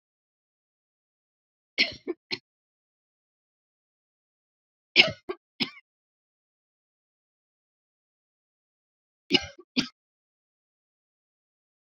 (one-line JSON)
{"three_cough_length": "11.9 s", "three_cough_amplitude": 28876, "three_cough_signal_mean_std_ratio": 0.15, "survey_phase": "beta (2021-08-13 to 2022-03-07)", "age": "45-64", "gender": "Female", "wearing_mask": "No", "symptom_none": true, "symptom_onset": "8 days", "smoker_status": "Never smoked", "respiratory_condition_asthma": false, "respiratory_condition_other": false, "recruitment_source": "REACT", "submission_delay": "1 day", "covid_test_result": "Negative", "covid_test_method": "RT-qPCR"}